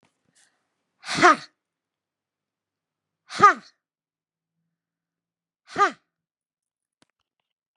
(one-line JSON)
{"exhalation_length": "7.8 s", "exhalation_amplitude": 31218, "exhalation_signal_mean_std_ratio": 0.19, "survey_phase": "beta (2021-08-13 to 2022-03-07)", "age": "65+", "gender": "Female", "wearing_mask": "No", "symptom_runny_or_blocked_nose": true, "symptom_onset": "12 days", "smoker_status": "Current smoker (1 to 10 cigarettes per day)", "respiratory_condition_asthma": false, "respiratory_condition_other": false, "recruitment_source": "REACT", "submission_delay": "2 days", "covid_test_result": "Negative", "covid_test_method": "RT-qPCR", "influenza_a_test_result": "Negative", "influenza_b_test_result": "Negative"}